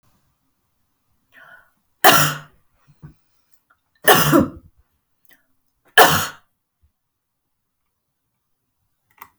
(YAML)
three_cough_length: 9.4 s
three_cough_amplitude: 32768
three_cough_signal_mean_std_ratio: 0.25
survey_phase: beta (2021-08-13 to 2022-03-07)
age: 65+
gender: Female
wearing_mask: 'No'
symptom_none: true
smoker_status: Ex-smoker
respiratory_condition_asthma: false
respiratory_condition_other: false
recruitment_source: REACT
submission_delay: 2 days
covid_test_result: Negative
covid_test_method: RT-qPCR
influenza_a_test_result: Negative
influenza_b_test_result: Negative